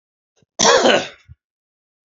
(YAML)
cough_length: 2.0 s
cough_amplitude: 31637
cough_signal_mean_std_ratio: 0.38
survey_phase: beta (2021-08-13 to 2022-03-07)
age: 45-64
gender: Male
wearing_mask: 'No'
symptom_runny_or_blocked_nose: true
symptom_onset: 11 days
smoker_status: Never smoked
respiratory_condition_asthma: true
respiratory_condition_other: false
recruitment_source: REACT
submission_delay: 2 days
covid_test_result: Negative
covid_test_method: RT-qPCR
influenza_a_test_result: Unknown/Void
influenza_b_test_result: Unknown/Void